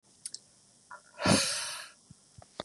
{"exhalation_length": "2.6 s", "exhalation_amplitude": 8059, "exhalation_signal_mean_std_ratio": 0.38, "survey_phase": "beta (2021-08-13 to 2022-03-07)", "age": "18-44", "gender": "Male", "wearing_mask": "No", "symptom_none": true, "smoker_status": "Never smoked", "respiratory_condition_asthma": false, "respiratory_condition_other": false, "recruitment_source": "REACT", "submission_delay": "2 days", "covid_test_result": "Negative", "covid_test_method": "RT-qPCR", "influenza_a_test_result": "Negative", "influenza_b_test_result": "Negative"}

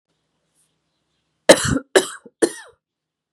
{"three_cough_length": "3.3 s", "three_cough_amplitude": 32768, "three_cough_signal_mean_std_ratio": 0.24, "survey_phase": "beta (2021-08-13 to 2022-03-07)", "age": "18-44", "gender": "Female", "wearing_mask": "No", "symptom_runny_or_blocked_nose": true, "symptom_sore_throat": true, "symptom_fever_high_temperature": true, "symptom_headache": true, "symptom_onset": "1 day", "smoker_status": "Never smoked", "respiratory_condition_asthma": false, "respiratory_condition_other": false, "recruitment_source": "Test and Trace", "submission_delay": "1 day", "covid_test_result": "Positive", "covid_test_method": "RT-qPCR", "covid_ct_value": 18.0, "covid_ct_gene": "N gene", "covid_ct_mean": 18.1, "covid_viral_load": "1100000 copies/ml", "covid_viral_load_category": "High viral load (>1M copies/ml)"}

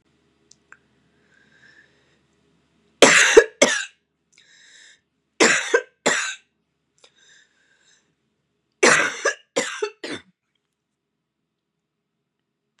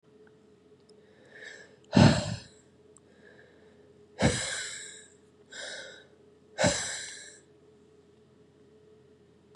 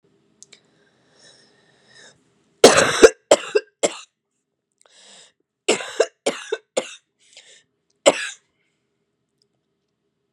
{"three_cough_length": "12.8 s", "three_cough_amplitude": 32768, "three_cough_signal_mean_std_ratio": 0.27, "exhalation_length": "9.6 s", "exhalation_amplitude": 16558, "exhalation_signal_mean_std_ratio": 0.29, "cough_length": "10.3 s", "cough_amplitude": 32768, "cough_signal_mean_std_ratio": 0.23, "survey_phase": "beta (2021-08-13 to 2022-03-07)", "age": "18-44", "gender": "Female", "wearing_mask": "No", "symptom_cough_any": true, "symptom_runny_or_blocked_nose": true, "symptom_sore_throat": true, "symptom_fatigue": true, "symptom_fever_high_temperature": true, "symptom_headache": true, "smoker_status": "Ex-smoker", "respiratory_condition_asthma": false, "respiratory_condition_other": false, "recruitment_source": "Test and Trace", "submission_delay": "0 days", "covid_test_result": "Positive", "covid_test_method": "LFT"}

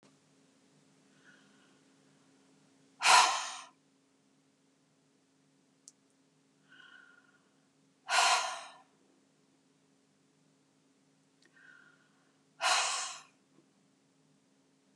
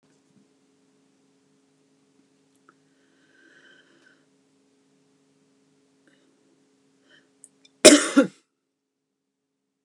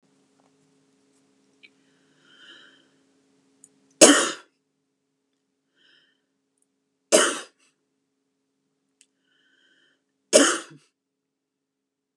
{"exhalation_length": "15.0 s", "exhalation_amplitude": 10989, "exhalation_signal_mean_std_ratio": 0.24, "cough_length": "9.8 s", "cough_amplitude": 32768, "cough_signal_mean_std_ratio": 0.14, "three_cough_length": "12.2 s", "three_cough_amplitude": 32767, "three_cough_signal_mean_std_ratio": 0.18, "survey_phase": "beta (2021-08-13 to 2022-03-07)", "age": "45-64", "gender": "Female", "wearing_mask": "No", "symptom_fatigue": true, "smoker_status": "Never smoked", "respiratory_condition_asthma": false, "respiratory_condition_other": false, "recruitment_source": "REACT", "submission_delay": "1 day", "covid_test_result": "Negative", "covid_test_method": "RT-qPCR", "influenza_a_test_result": "Negative", "influenza_b_test_result": "Negative"}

